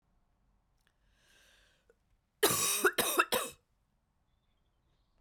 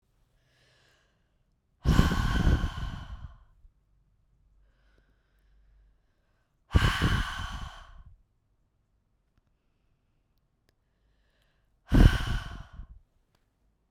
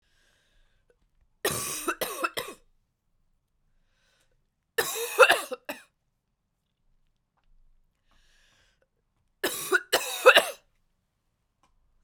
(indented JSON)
{
  "cough_length": "5.2 s",
  "cough_amplitude": 7653,
  "cough_signal_mean_std_ratio": 0.32,
  "exhalation_length": "13.9 s",
  "exhalation_amplitude": 18144,
  "exhalation_signal_mean_std_ratio": 0.3,
  "three_cough_length": "12.0 s",
  "three_cough_amplitude": 24733,
  "three_cough_signal_mean_std_ratio": 0.25,
  "survey_phase": "beta (2021-08-13 to 2022-03-07)",
  "age": "18-44",
  "gender": "Female",
  "wearing_mask": "No",
  "symptom_cough_any": true,
  "symptom_new_continuous_cough": true,
  "symptom_runny_or_blocked_nose": true,
  "symptom_sore_throat": true,
  "symptom_fatigue": true,
  "symptom_onset": "2 days",
  "smoker_status": "Ex-smoker",
  "respiratory_condition_asthma": false,
  "respiratory_condition_other": false,
  "recruitment_source": "Test and Trace",
  "submission_delay": "1 day",
  "covid_test_result": "Positive",
  "covid_test_method": "RT-qPCR",
  "covid_ct_value": 28.4,
  "covid_ct_gene": "N gene"
}